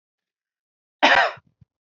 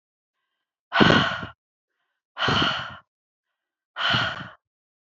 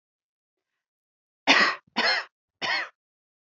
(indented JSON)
{
  "cough_length": "2.0 s",
  "cough_amplitude": 26111,
  "cough_signal_mean_std_ratio": 0.29,
  "exhalation_length": "5.0 s",
  "exhalation_amplitude": 27528,
  "exhalation_signal_mean_std_ratio": 0.39,
  "three_cough_length": "3.5 s",
  "three_cough_amplitude": 18703,
  "three_cough_signal_mean_std_ratio": 0.35,
  "survey_phase": "beta (2021-08-13 to 2022-03-07)",
  "age": "18-44",
  "gender": "Female",
  "wearing_mask": "No",
  "symptom_runny_or_blocked_nose": true,
  "symptom_sore_throat": true,
  "symptom_headache": true,
  "symptom_change_to_sense_of_smell_or_taste": true,
  "symptom_onset": "2 days",
  "smoker_status": "Never smoked",
  "respiratory_condition_asthma": true,
  "respiratory_condition_other": false,
  "recruitment_source": "Test and Trace",
  "submission_delay": "1 day",
  "covid_test_result": "Negative",
  "covid_test_method": "RT-qPCR"
}